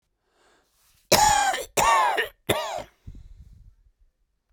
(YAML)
cough_length: 4.5 s
cough_amplitude: 23314
cough_signal_mean_std_ratio: 0.44
survey_phase: beta (2021-08-13 to 2022-03-07)
age: 45-64
gender: Male
wearing_mask: 'No'
symptom_none: true
smoker_status: Ex-smoker
respiratory_condition_asthma: true
respiratory_condition_other: true
recruitment_source: REACT
submission_delay: 6 days
covid_test_result: Negative
covid_test_method: RT-qPCR